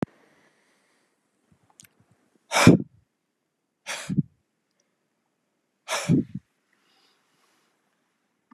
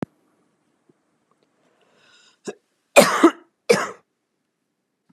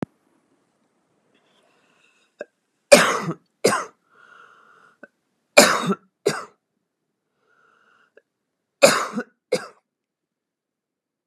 {"exhalation_length": "8.5 s", "exhalation_amplitude": 32767, "exhalation_signal_mean_std_ratio": 0.2, "cough_length": "5.1 s", "cough_amplitude": 32768, "cough_signal_mean_std_ratio": 0.22, "three_cough_length": "11.3 s", "three_cough_amplitude": 32768, "three_cough_signal_mean_std_ratio": 0.23, "survey_phase": "beta (2021-08-13 to 2022-03-07)", "age": "18-44", "gender": "Male", "wearing_mask": "No", "symptom_none": true, "smoker_status": "Never smoked", "respiratory_condition_asthma": false, "respiratory_condition_other": false, "recruitment_source": "REACT", "submission_delay": "1 day", "covid_test_result": "Negative", "covid_test_method": "RT-qPCR", "influenza_a_test_result": "Negative", "influenza_b_test_result": "Negative"}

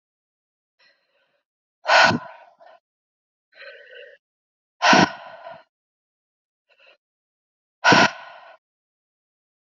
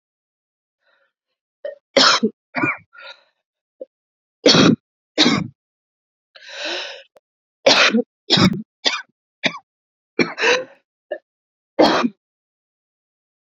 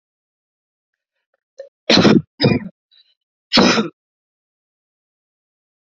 {"exhalation_length": "9.7 s", "exhalation_amplitude": 27152, "exhalation_signal_mean_std_ratio": 0.25, "three_cough_length": "13.6 s", "three_cough_amplitude": 32768, "three_cough_signal_mean_std_ratio": 0.35, "cough_length": "5.9 s", "cough_amplitude": 30581, "cough_signal_mean_std_ratio": 0.3, "survey_phase": "beta (2021-08-13 to 2022-03-07)", "age": "18-44", "gender": "Female", "wearing_mask": "No", "symptom_cough_any": true, "symptom_runny_or_blocked_nose": true, "symptom_fatigue": true, "symptom_headache": true, "symptom_other": true, "symptom_onset": "3 days", "smoker_status": "Never smoked", "respiratory_condition_asthma": false, "respiratory_condition_other": false, "recruitment_source": "Test and Trace", "submission_delay": "2 days", "covid_test_result": "Positive", "covid_test_method": "RT-qPCR", "covid_ct_value": 18.9, "covid_ct_gene": "ORF1ab gene", "covid_ct_mean": 19.2, "covid_viral_load": "500000 copies/ml", "covid_viral_load_category": "Low viral load (10K-1M copies/ml)"}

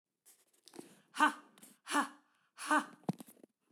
{"exhalation_length": "3.7 s", "exhalation_amplitude": 5145, "exhalation_signal_mean_std_ratio": 0.31, "survey_phase": "beta (2021-08-13 to 2022-03-07)", "age": "45-64", "gender": "Female", "wearing_mask": "No", "symptom_none": true, "smoker_status": "Never smoked", "respiratory_condition_asthma": false, "respiratory_condition_other": false, "recruitment_source": "REACT", "submission_delay": "1 day", "covid_test_result": "Negative", "covid_test_method": "RT-qPCR"}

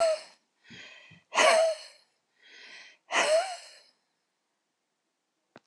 {"exhalation_length": "5.7 s", "exhalation_amplitude": 13579, "exhalation_signal_mean_std_ratio": 0.38, "survey_phase": "alpha (2021-03-01 to 2021-08-12)", "age": "65+", "gender": "Female", "wearing_mask": "No", "symptom_none": true, "smoker_status": "Ex-smoker", "respiratory_condition_asthma": false, "respiratory_condition_other": false, "recruitment_source": "REACT", "submission_delay": "2 days", "covid_test_result": "Negative", "covid_test_method": "RT-qPCR"}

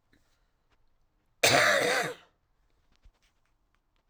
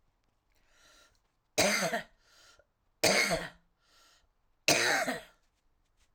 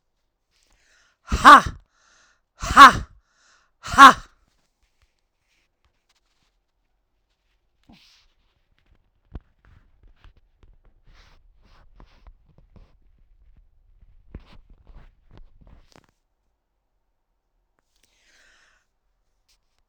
{"cough_length": "4.1 s", "cough_amplitude": 13163, "cough_signal_mean_std_ratio": 0.33, "three_cough_length": "6.1 s", "three_cough_amplitude": 12461, "three_cough_signal_mean_std_ratio": 0.38, "exhalation_length": "19.9 s", "exhalation_amplitude": 32768, "exhalation_signal_mean_std_ratio": 0.15, "survey_phase": "alpha (2021-03-01 to 2021-08-12)", "age": "45-64", "gender": "Female", "wearing_mask": "No", "symptom_cough_any": true, "symptom_shortness_of_breath": true, "symptom_headache": true, "smoker_status": "Never smoked", "respiratory_condition_asthma": true, "respiratory_condition_other": false, "recruitment_source": "REACT", "submission_delay": "1 day", "covid_test_result": "Negative", "covid_test_method": "RT-qPCR"}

